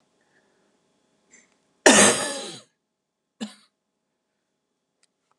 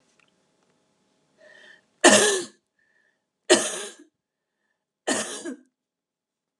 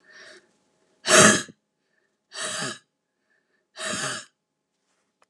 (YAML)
cough_length: 5.4 s
cough_amplitude: 32767
cough_signal_mean_std_ratio: 0.23
three_cough_length: 6.6 s
three_cough_amplitude: 27606
three_cough_signal_mean_std_ratio: 0.26
exhalation_length: 5.3 s
exhalation_amplitude: 30709
exhalation_signal_mean_std_ratio: 0.28
survey_phase: beta (2021-08-13 to 2022-03-07)
age: 45-64
gender: Female
wearing_mask: 'No'
symptom_cough_any: true
symptom_shortness_of_breath: true
symptom_fatigue: true
symptom_onset: 12 days
smoker_status: Ex-smoker
respiratory_condition_asthma: true
respiratory_condition_other: false
recruitment_source: REACT
submission_delay: 0 days
covid_test_result: Positive
covid_test_method: RT-qPCR
covid_ct_value: 30.0
covid_ct_gene: N gene
influenza_a_test_result: Negative
influenza_b_test_result: Negative